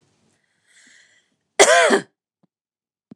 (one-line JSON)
{"cough_length": "3.2 s", "cough_amplitude": 29204, "cough_signal_mean_std_ratio": 0.29, "survey_phase": "beta (2021-08-13 to 2022-03-07)", "age": "45-64", "gender": "Female", "wearing_mask": "No", "symptom_none": true, "smoker_status": "Never smoked", "respiratory_condition_asthma": true, "respiratory_condition_other": false, "recruitment_source": "REACT", "submission_delay": "1 day", "covid_test_result": "Negative", "covid_test_method": "RT-qPCR", "influenza_a_test_result": "Negative", "influenza_b_test_result": "Negative"}